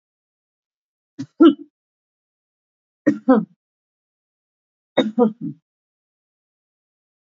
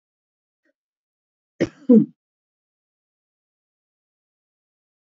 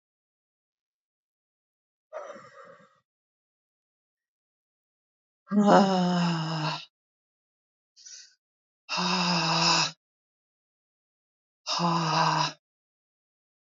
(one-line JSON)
{"three_cough_length": "7.3 s", "three_cough_amplitude": 26676, "three_cough_signal_mean_std_ratio": 0.23, "cough_length": "5.1 s", "cough_amplitude": 23676, "cough_signal_mean_std_ratio": 0.16, "exhalation_length": "13.7 s", "exhalation_amplitude": 17230, "exhalation_signal_mean_std_ratio": 0.38, "survey_phase": "alpha (2021-03-01 to 2021-08-12)", "age": "65+", "gender": "Female", "wearing_mask": "No", "symptom_none": true, "smoker_status": "Ex-smoker", "respiratory_condition_asthma": false, "respiratory_condition_other": false, "recruitment_source": "REACT", "submission_delay": "2 days", "covid_test_result": "Negative", "covid_test_method": "RT-qPCR"}